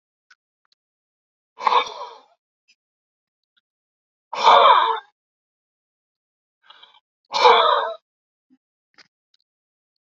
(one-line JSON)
{"exhalation_length": "10.2 s", "exhalation_amplitude": 28635, "exhalation_signal_mean_std_ratio": 0.28, "survey_phase": "beta (2021-08-13 to 2022-03-07)", "age": "45-64", "gender": "Male", "wearing_mask": "No", "symptom_none": true, "smoker_status": "Never smoked", "respiratory_condition_asthma": false, "respiratory_condition_other": false, "recruitment_source": "REACT", "submission_delay": "1 day", "covid_test_result": "Negative", "covid_test_method": "RT-qPCR"}